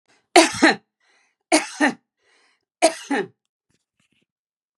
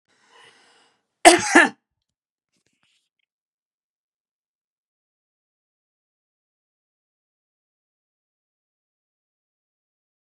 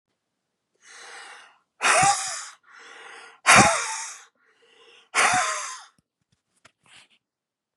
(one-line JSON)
{"three_cough_length": "4.8 s", "three_cough_amplitude": 32767, "three_cough_signal_mean_std_ratio": 0.3, "cough_length": "10.3 s", "cough_amplitude": 32768, "cough_signal_mean_std_ratio": 0.13, "exhalation_length": "7.8 s", "exhalation_amplitude": 25994, "exhalation_signal_mean_std_ratio": 0.35, "survey_phase": "beta (2021-08-13 to 2022-03-07)", "age": "65+", "gender": "Female", "wearing_mask": "No", "symptom_none": true, "smoker_status": "Never smoked", "respiratory_condition_asthma": false, "respiratory_condition_other": false, "recruitment_source": "REACT", "submission_delay": "1 day", "covid_test_result": "Negative", "covid_test_method": "RT-qPCR", "influenza_a_test_result": "Unknown/Void", "influenza_b_test_result": "Unknown/Void"}